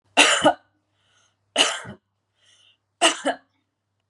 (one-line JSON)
{"three_cough_length": "4.1 s", "three_cough_amplitude": 31377, "three_cough_signal_mean_std_ratio": 0.33, "survey_phase": "beta (2021-08-13 to 2022-03-07)", "age": "45-64", "gender": "Female", "wearing_mask": "No", "symptom_runny_or_blocked_nose": true, "symptom_fatigue": true, "symptom_onset": "13 days", "smoker_status": "Never smoked", "respiratory_condition_asthma": false, "respiratory_condition_other": false, "recruitment_source": "REACT", "submission_delay": "2 days", "covid_test_result": "Negative", "covid_test_method": "RT-qPCR", "influenza_a_test_result": "Negative", "influenza_b_test_result": "Negative"}